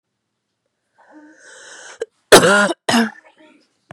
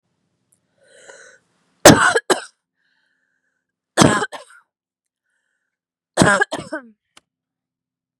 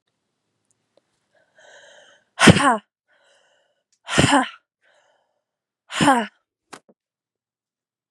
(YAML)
cough_length: 3.9 s
cough_amplitude: 32768
cough_signal_mean_std_ratio: 0.31
three_cough_length: 8.2 s
three_cough_amplitude: 32768
three_cough_signal_mean_std_ratio: 0.25
exhalation_length: 8.1 s
exhalation_amplitude: 32768
exhalation_signal_mean_std_ratio: 0.25
survey_phase: beta (2021-08-13 to 2022-03-07)
age: 18-44
gender: Female
wearing_mask: 'No'
symptom_cough_any: true
symptom_runny_or_blocked_nose: true
symptom_sore_throat: true
symptom_fatigue: true
symptom_headache: true
symptom_change_to_sense_of_smell_or_taste: true
symptom_loss_of_taste: true
symptom_onset: 3 days
smoker_status: Never smoked
respiratory_condition_asthma: true
respiratory_condition_other: false
recruitment_source: Test and Trace
submission_delay: 2 days
covid_test_result: Positive
covid_test_method: RT-qPCR
covid_ct_value: 25.0
covid_ct_gene: ORF1ab gene